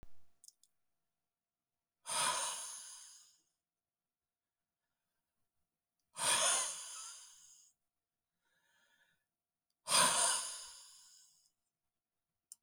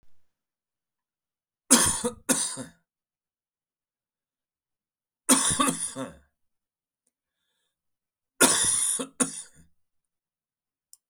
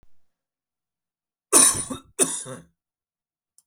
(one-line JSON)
{"exhalation_length": "12.6 s", "exhalation_amplitude": 5289, "exhalation_signal_mean_std_ratio": 0.33, "three_cough_length": "11.1 s", "three_cough_amplitude": 28339, "three_cough_signal_mean_std_ratio": 0.32, "cough_length": "3.7 s", "cough_amplitude": 28685, "cough_signal_mean_std_ratio": 0.28, "survey_phase": "beta (2021-08-13 to 2022-03-07)", "age": "45-64", "gender": "Male", "wearing_mask": "No", "symptom_cough_any": true, "symptom_runny_or_blocked_nose": true, "symptom_fatigue": true, "symptom_onset": "3 days", "smoker_status": "Never smoked", "respiratory_condition_asthma": false, "respiratory_condition_other": false, "recruitment_source": "REACT", "submission_delay": "3 days", "covid_test_result": "Negative", "covid_test_method": "RT-qPCR"}